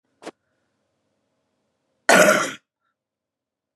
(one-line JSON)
{"cough_length": "3.8 s", "cough_amplitude": 30969, "cough_signal_mean_std_ratio": 0.25, "survey_phase": "beta (2021-08-13 to 2022-03-07)", "age": "45-64", "gender": "Female", "wearing_mask": "No", "symptom_cough_any": true, "symptom_new_continuous_cough": true, "symptom_runny_or_blocked_nose": true, "symptom_sore_throat": true, "symptom_fatigue": true, "symptom_headache": true, "symptom_onset": "3 days", "smoker_status": "Ex-smoker", "respiratory_condition_asthma": false, "respiratory_condition_other": false, "recruitment_source": "Test and Trace", "submission_delay": "2 days", "covid_test_result": "Negative", "covid_test_method": "RT-qPCR"}